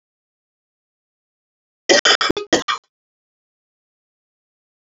{"cough_length": "4.9 s", "cough_amplitude": 32768, "cough_signal_mean_std_ratio": 0.24, "survey_phase": "beta (2021-08-13 to 2022-03-07)", "age": "45-64", "gender": "Female", "wearing_mask": "No", "symptom_cough_any": true, "symptom_runny_or_blocked_nose": true, "symptom_onset": "12 days", "smoker_status": "Ex-smoker", "respiratory_condition_asthma": false, "respiratory_condition_other": true, "recruitment_source": "REACT", "submission_delay": "1 day", "covid_test_result": "Negative", "covid_test_method": "RT-qPCR"}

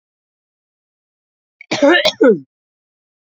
{"cough_length": "3.3 s", "cough_amplitude": 32767, "cough_signal_mean_std_ratio": 0.32, "survey_phase": "beta (2021-08-13 to 2022-03-07)", "age": "45-64", "gender": "Male", "wearing_mask": "No", "symptom_none": true, "smoker_status": "Never smoked", "respiratory_condition_asthma": false, "respiratory_condition_other": false, "recruitment_source": "REACT", "submission_delay": "1 day", "covid_test_result": "Negative", "covid_test_method": "RT-qPCR", "influenza_a_test_result": "Negative", "influenza_b_test_result": "Negative"}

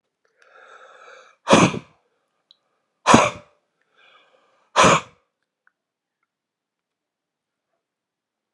{"exhalation_length": "8.5 s", "exhalation_amplitude": 32768, "exhalation_signal_mean_std_ratio": 0.23, "survey_phase": "alpha (2021-03-01 to 2021-08-12)", "age": "45-64", "gender": "Male", "wearing_mask": "No", "symptom_none": true, "smoker_status": "Ex-smoker", "respiratory_condition_asthma": false, "respiratory_condition_other": false, "recruitment_source": "REACT", "submission_delay": "4 days", "covid_test_result": "Negative", "covid_test_method": "RT-qPCR"}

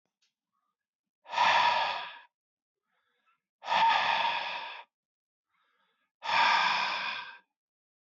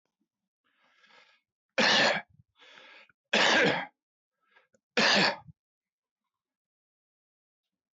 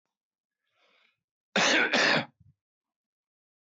{"exhalation_length": "8.1 s", "exhalation_amplitude": 6856, "exhalation_signal_mean_std_ratio": 0.48, "three_cough_length": "7.9 s", "three_cough_amplitude": 11627, "three_cough_signal_mean_std_ratio": 0.34, "cough_length": "3.7 s", "cough_amplitude": 10035, "cough_signal_mean_std_ratio": 0.35, "survey_phase": "beta (2021-08-13 to 2022-03-07)", "age": "45-64", "gender": "Male", "wearing_mask": "No", "symptom_none": true, "smoker_status": "Current smoker (11 or more cigarettes per day)", "respiratory_condition_asthma": false, "respiratory_condition_other": false, "recruitment_source": "REACT", "submission_delay": "1 day", "covid_test_result": "Negative", "covid_test_method": "RT-qPCR", "influenza_a_test_result": "Negative", "influenza_b_test_result": "Negative"}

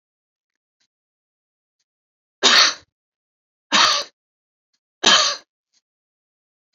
{"three_cough_length": "6.7 s", "three_cough_amplitude": 32767, "three_cough_signal_mean_std_ratio": 0.28, "survey_phase": "beta (2021-08-13 to 2022-03-07)", "age": "65+", "gender": "Female", "wearing_mask": "No", "symptom_shortness_of_breath": true, "smoker_status": "Never smoked", "respiratory_condition_asthma": false, "respiratory_condition_other": false, "recruitment_source": "REACT", "submission_delay": "1 day", "covid_test_result": "Negative", "covid_test_method": "RT-qPCR"}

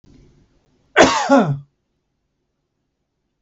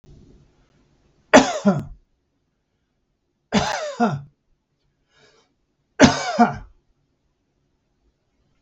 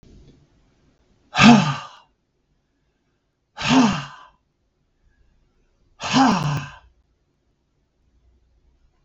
{"cough_length": "3.4 s", "cough_amplitude": 32766, "cough_signal_mean_std_ratio": 0.31, "three_cough_length": "8.6 s", "three_cough_amplitude": 32766, "three_cough_signal_mean_std_ratio": 0.28, "exhalation_length": "9.0 s", "exhalation_amplitude": 32768, "exhalation_signal_mean_std_ratio": 0.29, "survey_phase": "beta (2021-08-13 to 2022-03-07)", "age": "65+", "gender": "Male", "wearing_mask": "No", "symptom_none": true, "smoker_status": "Ex-smoker", "respiratory_condition_asthma": false, "respiratory_condition_other": false, "recruitment_source": "REACT", "submission_delay": "1 day", "covid_test_result": "Negative", "covid_test_method": "RT-qPCR"}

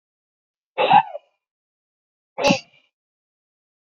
{"exhalation_length": "3.8 s", "exhalation_amplitude": 26350, "exhalation_signal_mean_std_ratio": 0.26, "survey_phase": "beta (2021-08-13 to 2022-03-07)", "age": "65+", "gender": "Male", "wearing_mask": "No", "symptom_runny_or_blocked_nose": true, "symptom_fatigue": true, "smoker_status": "Ex-smoker", "respiratory_condition_asthma": true, "respiratory_condition_other": false, "recruitment_source": "Test and Trace", "submission_delay": "0 days", "covid_test_result": "Negative", "covid_test_method": "LFT"}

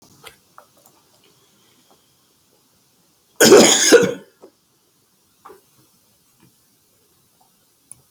{"cough_length": "8.1 s", "cough_amplitude": 32768, "cough_signal_mean_std_ratio": 0.24, "survey_phase": "beta (2021-08-13 to 2022-03-07)", "age": "65+", "gender": "Male", "wearing_mask": "No", "symptom_none": true, "smoker_status": "Ex-smoker", "respiratory_condition_asthma": true, "respiratory_condition_other": true, "recruitment_source": "REACT", "submission_delay": "1 day", "covid_test_result": "Negative", "covid_test_method": "RT-qPCR", "influenza_a_test_result": "Negative", "influenza_b_test_result": "Negative"}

